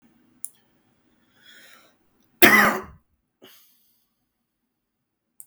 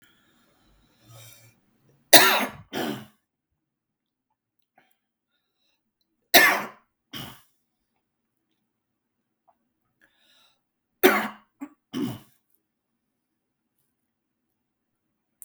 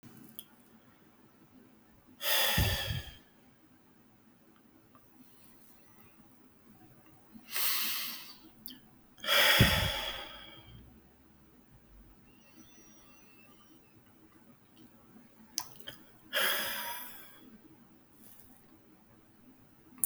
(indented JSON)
{
  "cough_length": "5.5 s",
  "cough_amplitude": 32768,
  "cough_signal_mean_std_ratio": 0.2,
  "three_cough_length": "15.4 s",
  "three_cough_amplitude": 32768,
  "three_cough_signal_mean_std_ratio": 0.19,
  "exhalation_length": "20.1 s",
  "exhalation_amplitude": 13214,
  "exhalation_signal_mean_std_ratio": 0.37,
  "survey_phase": "beta (2021-08-13 to 2022-03-07)",
  "age": "18-44",
  "gender": "Male",
  "wearing_mask": "No",
  "symptom_cough_any": true,
  "symptom_runny_or_blocked_nose": true,
  "symptom_sore_throat": true,
  "symptom_fatigue": true,
  "symptom_fever_high_temperature": true,
  "symptom_headache": true,
  "symptom_change_to_sense_of_smell_or_taste": true,
  "symptom_onset": "7 days",
  "smoker_status": "Ex-smoker",
  "respiratory_condition_asthma": true,
  "respiratory_condition_other": false,
  "recruitment_source": "Test and Trace",
  "submission_delay": "2 days",
  "covid_test_result": "Positive",
  "covid_test_method": "RT-qPCR",
  "covid_ct_value": 16.3,
  "covid_ct_gene": "N gene",
  "covid_ct_mean": 16.8,
  "covid_viral_load": "3000000 copies/ml",
  "covid_viral_load_category": "High viral load (>1M copies/ml)"
}